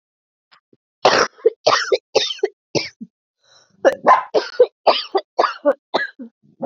{"cough_length": "6.7 s", "cough_amplitude": 29593, "cough_signal_mean_std_ratio": 0.41, "survey_phase": "beta (2021-08-13 to 2022-03-07)", "age": "45-64", "gender": "Female", "wearing_mask": "No", "symptom_cough_any": true, "symptom_new_continuous_cough": true, "symptom_runny_or_blocked_nose": true, "symptom_shortness_of_breath": true, "symptom_sore_throat": true, "symptom_abdominal_pain": true, "symptom_diarrhoea": true, "symptom_fatigue": true, "symptom_fever_high_temperature": true, "symptom_headache": true, "symptom_change_to_sense_of_smell_or_taste": true, "symptom_loss_of_taste": true, "symptom_onset": "5 days", "smoker_status": "Ex-smoker", "respiratory_condition_asthma": true, "respiratory_condition_other": false, "recruitment_source": "Test and Trace", "submission_delay": "2 days", "covid_test_result": "Positive", "covid_test_method": "RT-qPCR", "covid_ct_value": 18.7, "covid_ct_gene": "ORF1ab gene", "covid_ct_mean": 19.7, "covid_viral_load": "350000 copies/ml", "covid_viral_load_category": "Low viral load (10K-1M copies/ml)"}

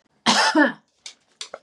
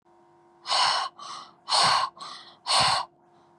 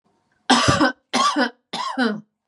{"cough_length": "1.6 s", "cough_amplitude": 23357, "cough_signal_mean_std_ratio": 0.45, "exhalation_length": "3.6 s", "exhalation_amplitude": 12175, "exhalation_signal_mean_std_ratio": 0.53, "three_cough_length": "2.5 s", "three_cough_amplitude": 30646, "three_cough_signal_mean_std_ratio": 0.58, "survey_phase": "beta (2021-08-13 to 2022-03-07)", "age": "18-44", "gender": "Female", "wearing_mask": "No", "symptom_none": true, "smoker_status": "Current smoker (1 to 10 cigarettes per day)", "respiratory_condition_asthma": false, "respiratory_condition_other": false, "recruitment_source": "REACT", "submission_delay": "4 days", "covid_test_result": "Negative", "covid_test_method": "RT-qPCR", "influenza_a_test_result": "Negative", "influenza_b_test_result": "Negative"}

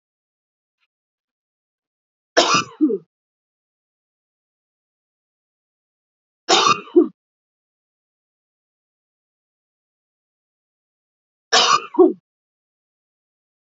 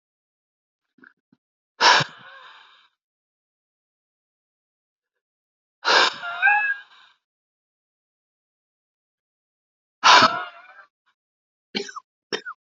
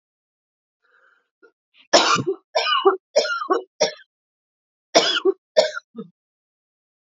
{"three_cough_length": "13.7 s", "three_cough_amplitude": 29934, "three_cough_signal_mean_std_ratio": 0.23, "exhalation_length": "12.8 s", "exhalation_amplitude": 28341, "exhalation_signal_mean_std_ratio": 0.25, "cough_length": "7.1 s", "cough_amplitude": 32768, "cough_signal_mean_std_ratio": 0.38, "survey_phase": "beta (2021-08-13 to 2022-03-07)", "age": "18-44", "gender": "Female", "wearing_mask": "No", "symptom_cough_any": true, "symptom_new_continuous_cough": true, "symptom_runny_or_blocked_nose": true, "symptom_change_to_sense_of_smell_or_taste": true, "symptom_loss_of_taste": true, "symptom_onset": "6 days", "smoker_status": "Ex-smoker", "respiratory_condition_asthma": false, "respiratory_condition_other": false, "recruitment_source": "Test and Trace", "submission_delay": "2 days", "covid_test_result": "Positive", "covid_test_method": "RT-qPCR", "covid_ct_value": 34.1, "covid_ct_gene": "ORF1ab gene"}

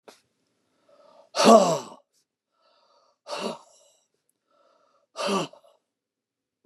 {"exhalation_length": "6.7 s", "exhalation_amplitude": 23903, "exhalation_signal_mean_std_ratio": 0.25, "survey_phase": "beta (2021-08-13 to 2022-03-07)", "age": "65+", "gender": "Male", "wearing_mask": "No", "symptom_none": true, "smoker_status": "Never smoked", "respiratory_condition_asthma": false, "respiratory_condition_other": false, "recruitment_source": "REACT", "submission_delay": "5 days", "covid_test_result": "Negative", "covid_test_method": "RT-qPCR", "influenza_a_test_result": "Negative", "influenza_b_test_result": "Negative"}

